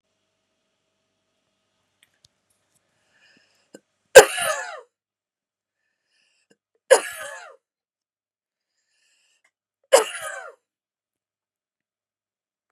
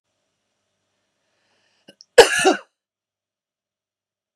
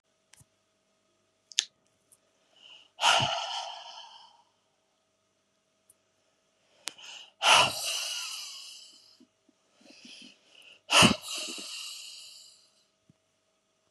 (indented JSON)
{
  "three_cough_length": "12.7 s",
  "three_cough_amplitude": 32768,
  "three_cough_signal_mean_std_ratio": 0.14,
  "cough_length": "4.4 s",
  "cough_amplitude": 32768,
  "cough_signal_mean_std_ratio": 0.18,
  "exhalation_length": "13.9 s",
  "exhalation_amplitude": 30106,
  "exhalation_signal_mean_std_ratio": 0.29,
  "survey_phase": "beta (2021-08-13 to 2022-03-07)",
  "age": "45-64",
  "gender": "Female",
  "wearing_mask": "No",
  "symptom_none": true,
  "symptom_onset": "8 days",
  "smoker_status": "Ex-smoker",
  "respiratory_condition_asthma": false,
  "respiratory_condition_other": false,
  "recruitment_source": "REACT",
  "submission_delay": "4 days",
  "covid_test_result": "Negative",
  "covid_test_method": "RT-qPCR",
  "influenza_a_test_result": "Negative",
  "influenza_b_test_result": "Negative"
}